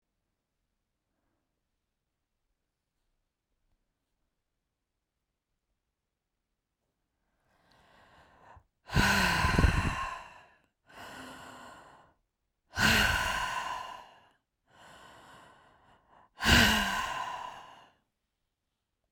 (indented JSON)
{
  "exhalation_length": "19.1 s",
  "exhalation_amplitude": 11718,
  "exhalation_signal_mean_std_ratio": 0.33,
  "survey_phase": "beta (2021-08-13 to 2022-03-07)",
  "age": "45-64",
  "gender": "Female",
  "wearing_mask": "No",
  "symptom_headache": true,
  "smoker_status": "Never smoked",
  "respiratory_condition_asthma": false,
  "respiratory_condition_other": false,
  "recruitment_source": "REACT",
  "submission_delay": "1 day",
  "covid_test_result": "Negative",
  "covid_test_method": "RT-qPCR"
}